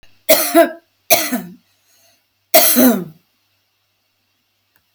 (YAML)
three_cough_length: 4.9 s
three_cough_amplitude: 32768
three_cough_signal_mean_std_ratio: 0.38
survey_phase: alpha (2021-03-01 to 2021-08-12)
age: 65+
gender: Female
wearing_mask: 'No'
symptom_none: true
smoker_status: Ex-smoker
respiratory_condition_asthma: true
respiratory_condition_other: false
recruitment_source: REACT
submission_delay: 1 day
covid_test_result: Negative
covid_test_method: RT-qPCR